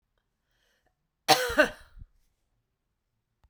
cough_length: 3.5 s
cough_amplitude: 18629
cough_signal_mean_std_ratio: 0.23
survey_phase: beta (2021-08-13 to 2022-03-07)
age: 45-64
gender: Female
wearing_mask: 'No'
symptom_none: true
smoker_status: Never smoked
respiratory_condition_asthma: false
respiratory_condition_other: false
recruitment_source: REACT
submission_delay: 1 day
covid_test_result: Negative
covid_test_method: RT-qPCR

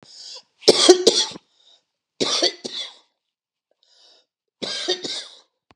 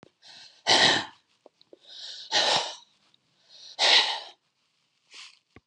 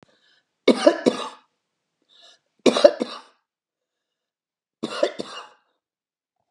cough_length: 5.8 s
cough_amplitude: 32768
cough_signal_mean_std_ratio: 0.33
exhalation_length: 5.7 s
exhalation_amplitude: 16520
exhalation_signal_mean_std_ratio: 0.38
three_cough_length: 6.5 s
three_cough_amplitude: 32768
three_cough_signal_mean_std_ratio: 0.24
survey_phase: beta (2021-08-13 to 2022-03-07)
age: 65+
gender: Female
wearing_mask: 'No'
symptom_none: true
smoker_status: Ex-smoker
respiratory_condition_asthma: false
respiratory_condition_other: false
recruitment_source: REACT
submission_delay: 2 days
covid_test_result: Negative
covid_test_method: RT-qPCR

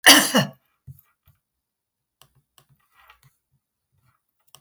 cough_length: 4.6 s
cough_amplitude: 32069
cough_signal_mean_std_ratio: 0.2
survey_phase: beta (2021-08-13 to 2022-03-07)
age: 65+
gender: Female
wearing_mask: 'No'
symptom_none: true
symptom_onset: 11 days
smoker_status: Ex-smoker
respiratory_condition_asthma: false
respiratory_condition_other: false
recruitment_source: REACT
submission_delay: 0 days
covid_test_result: Negative
covid_test_method: RT-qPCR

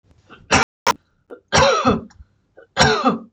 three_cough_length: 3.3 s
three_cough_amplitude: 26025
three_cough_signal_mean_std_ratio: 0.48
survey_phase: beta (2021-08-13 to 2022-03-07)
age: 45-64
gender: Female
wearing_mask: 'Yes'
symptom_none: true
symptom_onset: 6 days
smoker_status: Never smoked
respiratory_condition_asthma: false
respiratory_condition_other: false
recruitment_source: REACT
submission_delay: 21 days
covid_test_result: Negative
covid_test_method: RT-qPCR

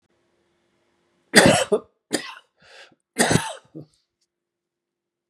three_cough_length: 5.3 s
three_cough_amplitude: 32768
three_cough_signal_mean_std_ratio: 0.28
survey_phase: beta (2021-08-13 to 2022-03-07)
age: 45-64
gender: Male
wearing_mask: 'No'
symptom_cough_any: true
symptom_runny_or_blocked_nose: true
symptom_diarrhoea: true
symptom_fatigue: true
symptom_onset: 3 days
smoker_status: Current smoker (e-cigarettes or vapes only)
respiratory_condition_asthma: false
respiratory_condition_other: false
recruitment_source: Test and Trace
submission_delay: 2 days
covid_test_result: Positive
covid_test_method: RT-qPCR
covid_ct_value: 19.1
covid_ct_gene: ORF1ab gene
covid_ct_mean: 19.7
covid_viral_load: 360000 copies/ml
covid_viral_load_category: Low viral load (10K-1M copies/ml)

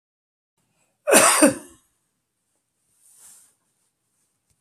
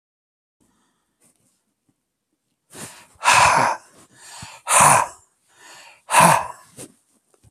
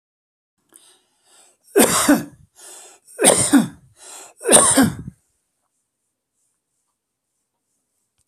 cough_length: 4.6 s
cough_amplitude: 32767
cough_signal_mean_std_ratio: 0.25
exhalation_length: 7.5 s
exhalation_amplitude: 32767
exhalation_signal_mean_std_ratio: 0.34
three_cough_length: 8.3 s
three_cough_amplitude: 32768
three_cough_signal_mean_std_ratio: 0.33
survey_phase: beta (2021-08-13 to 2022-03-07)
age: 65+
gender: Male
wearing_mask: 'No'
symptom_fatigue: true
smoker_status: Never smoked
respiratory_condition_asthma: true
respiratory_condition_other: false
recruitment_source: REACT
submission_delay: 1 day
covid_test_result: Negative
covid_test_method: RT-qPCR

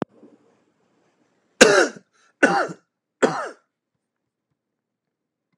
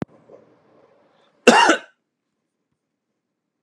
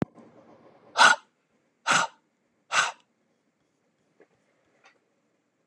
three_cough_length: 5.6 s
three_cough_amplitude: 32768
three_cough_signal_mean_std_ratio: 0.26
cough_length: 3.6 s
cough_amplitude: 32768
cough_signal_mean_std_ratio: 0.23
exhalation_length: 5.7 s
exhalation_amplitude: 22076
exhalation_signal_mean_std_ratio: 0.24
survey_phase: beta (2021-08-13 to 2022-03-07)
age: 45-64
gender: Male
wearing_mask: 'No'
symptom_none: true
smoker_status: Never smoked
respiratory_condition_asthma: false
respiratory_condition_other: false
recruitment_source: Test and Trace
submission_delay: 1 day
covid_test_result: Positive
covid_test_method: RT-qPCR
covid_ct_value: 19.0
covid_ct_gene: N gene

